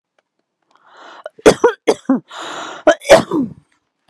{"cough_length": "4.1 s", "cough_amplitude": 32768, "cough_signal_mean_std_ratio": 0.35, "survey_phase": "alpha (2021-03-01 to 2021-08-12)", "age": "45-64", "gender": "Female", "wearing_mask": "No", "symptom_none": true, "smoker_status": "Never smoked", "respiratory_condition_asthma": false, "respiratory_condition_other": false, "recruitment_source": "REACT", "submission_delay": "2 days", "covid_test_result": "Negative", "covid_test_method": "RT-qPCR"}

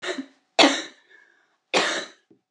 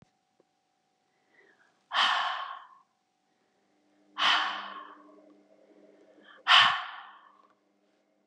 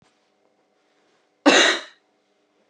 {"three_cough_length": "2.5 s", "three_cough_amplitude": 29040, "three_cough_signal_mean_std_ratio": 0.37, "exhalation_length": "8.3 s", "exhalation_amplitude": 15030, "exhalation_signal_mean_std_ratio": 0.31, "cough_length": "2.7 s", "cough_amplitude": 26241, "cough_signal_mean_std_ratio": 0.28, "survey_phase": "beta (2021-08-13 to 2022-03-07)", "age": "18-44", "gender": "Female", "wearing_mask": "No", "symptom_new_continuous_cough": true, "symptom_sore_throat": true, "symptom_fatigue": true, "symptom_onset": "2 days", "smoker_status": "Never smoked", "respiratory_condition_asthma": false, "respiratory_condition_other": false, "recruitment_source": "Test and Trace", "submission_delay": "2 days", "covid_test_result": "Negative", "covid_test_method": "RT-qPCR"}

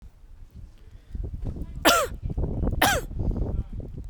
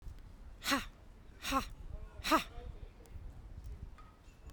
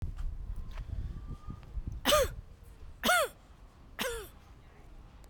{"cough_length": "4.1 s", "cough_amplitude": 25701, "cough_signal_mean_std_ratio": 0.66, "exhalation_length": "4.5 s", "exhalation_amplitude": 5099, "exhalation_signal_mean_std_ratio": 0.53, "three_cough_length": "5.3 s", "three_cough_amplitude": 7077, "three_cough_signal_mean_std_ratio": 0.56, "survey_phase": "beta (2021-08-13 to 2022-03-07)", "age": "18-44", "gender": "Female", "wearing_mask": "No", "symptom_none": true, "smoker_status": "Never smoked", "respiratory_condition_asthma": false, "respiratory_condition_other": false, "recruitment_source": "REACT", "submission_delay": "1 day", "covid_test_result": "Negative", "covid_test_method": "RT-qPCR"}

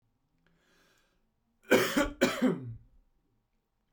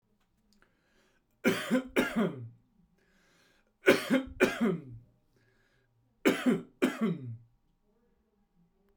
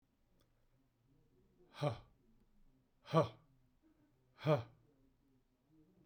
{"cough_length": "3.9 s", "cough_amplitude": 11520, "cough_signal_mean_std_ratio": 0.34, "three_cough_length": "9.0 s", "three_cough_amplitude": 10917, "three_cough_signal_mean_std_ratio": 0.38, "exhalation_length": "6.1 s", "exhalation_amplitude": 3451, "exhalation_signal_mean_std_ratio": 0.24, "survey_phase": "beta (2021-08-13 to 2022-03-07)", "age": "18-44", "gender": "Male", "wearing_mask": "No", "symptom_none": true, "smoker_status": "Ex-smoker", "respiratory_condition_asthma": false, "respiratory_condition_other": false, "recruitment_source": "REACT", "submission_delay": "1 day", "covid_test_result": "Negative", "covid_test_method": "RT-qPCR", "influenza_a_test_result": "Negative", "influenza_b_test_result": "Negative"}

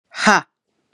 {"exhalation_length": "0.9 s", "exhalation_amplitude": 32767, "exhalation_signal_mean_std_ratio": 0.35, "survey_phase": "beta (2021-08-13 to 2022-03-07)", "age": "18-44", "gender": "Female", "wearing_mask": "No", "symptom_runny_or_blocked_nose": true, "symptom_sore_throat": true, "symptom_onset": "4 days", "smoker_status": "Never smoked", "respiratory_condition_asthma": false, "respiratory_condition_other": false, "recruitment_source": "Test and Trace", "submission_delay": "2 days", "covid_test_result": "Negative", "covid_test_method": "RT-qPCR"}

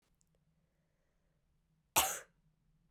{"cough_length": "2.9 s", "cough_amplitude": 6474, "cough_signal_mean_std_ratio": 0.2, "survey_phase": "beta (2021-08-13 to 2022-03-07)", "age": "18-44", "gender": "Female", "wearing_mask": "No", "symptom_cough_any": true, "symptom_runny_or_blocked_nose": true, "symptom_shortness_of_breath": true, "symptom_sore_throat": true, "symptom_fatigue": true, "symptom_fever_high_temperature": true, "symptom_headache": true, "symptom_change_to_sense_of_smell_or_taste": true, "symptom_other": true, "smoker_status": "Ex-smoker", "respiratory_condition_asthma": false, "respiratory_condition_other": false, "recruitment_source": "Test and Trace", "submission_delay": "2 days", "covid_test_result": "Positive", "covid_test_method": "RT-qPCR", "covid_ct_value": 35.5, "covid_ct_gene": "ORF1ab gene"}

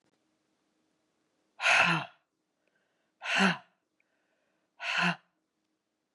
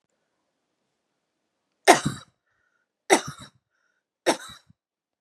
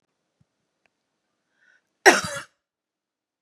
{"exhalation_length": "6.1 s", "exhalation_amplitude": 9146, "exhalation_signal_mean_std_ratio": 0.32, "three_cough_length": "5.2 s", "three_cough_amplitude": 31693, "three_cough_signal_mean_std_ratio": 0.2, "cough_length": "3.4 s", "cough_amplitude": 32767, "cough_signal_mean_std_ratio": 0.17, "survey_phase": "beta (2021-08-13 to 2022-03-07)", "age": "45-64", "gender": "Female", "wearing_mask": "No", "symptom_none": true, "smoker_status": "Never smoked", "respiratory_condition_asthma": false, "respiratory_condition_other": false, "recruitment_source": "REACT", "submission_delay": "2 days", "covid_test_result": "Negative", "covid_test_method": "RT-qPCR", "influenza_a_test_result": "Negative", "influenza_b_test_result": "Negative"}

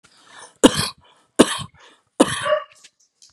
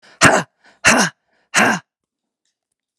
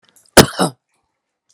{"three_cough_length": "3.3 s", "three_cough_amplitude": 32768, "three_cough_signal_mean_std_ratio": 0.31, "exhalation_length": "3.0 s", "exhalation_amplitude": 32768, "exhalation_signal_mean_std_ratio": 0.38, "cough_length": "1.5 s", "cough_amplitude": 32768, "cough_signal_mean_std_ratio": 0.25, "survey_phase": "beta (2021-08-13 to 2022-03-07)", "age": "45-64", "gender": "Female", "wearing_mask": "No", "symptom_none": true, "smoker_status": "Never smoked", "respiratory_condition_asthma": true, "respiratory_condition_other": false, "recruitment_source": "REACT", "submission_delay": "0 days", "covid_test_result": "Negative", "covid_test_method": "RT-qPCR"}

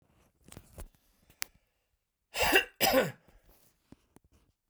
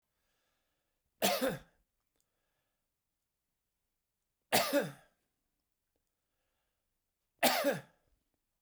{"cough_length": "4.7 s", "cough_amplitude": 14816, "cough_signal_mean_std_ratio": 0.29, "three_cough_length": "8.6 s", "three_cough_amplitude": 7128, "three_cough_signal_mean_std_ratio": 0.27, "survey_phase": "beta (2021-08-13 to 2022-03-07)", "age": "65+", "gender": "Male", "wearing_mask": "No", "symptom_none": true, "smoker_status": "Never smoked", "respiratory_condition_asthma": false, "respiratory_condition_other": false, "recruitment_source": "REACT", "submission_delay": "1 day", "covid_test_result": "Negative", "covid_test_method": "RT-qPCR"}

